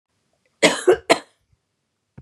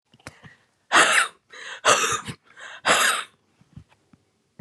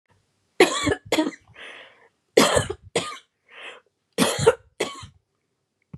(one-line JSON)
{"cough_length": "2.2 s", "cough_amplitude": 30804, "cough_signal_mean_std_ratio": 0.29, "exhalation_length": "4.6 s", "exhalation_amplitude": 23846, "exhalation_signal_mean_std_ratio": 0.41, "three_cough_length": "6.0 s", "three_cough_amplitude": 29010, "three_cough_signal_mean_std_ratio": 0.36, "survey_phase": "beta (2021-08-13 to 2022-03-07)", "age": "65+", "gender": "Female", "wearing_mask": "No", "symptom_runny_or_blocked_nose": true, "symptom_change_to_sense_of_smell_or_taste": true, "symptom_loss_of_taste": true, "smoker_status": "Never smoked", "respiratory_condition_asthma": false, "respiratory_condition_other": false, "recruitment_source": "REACT", "submission_delay": "2 days", "covid_test_result": "Negative", "covid_test_method": "RT-qPCR", "influenza_a_test_result": "Negative", "influenza_b_test_result": "Negative"}